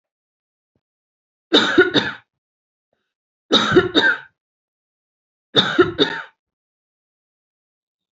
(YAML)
three_cough_length: 8.2 s
three_cough_amplitude: 30364
three_cough_signal_mean_std_ratio: 0.33
survey_phase: beta (2021-08-13 to 2022-03-07)
age: 18-44
gender: Female
wearing_mask: 'No'
symptom_cough_any: true
symptom_new_continuous_cough: true
symptom_runny_or_blocked_nose: true
symptom_sore_throat: true
symptom_fatigue: true
symptom_fever_high_temperature: true
symptom_onset: 3 days
smoker_status: Ex-smoker
respiratory_condition_asthma: false
respiratory_condition_other: false
recruitment_source: Test and Trace
submission_delay: 2 days
covid_test_result: Positive
covid_test_method: RT-qPCR
covid_ct_value: 23.5
covid_ct_gene: N gene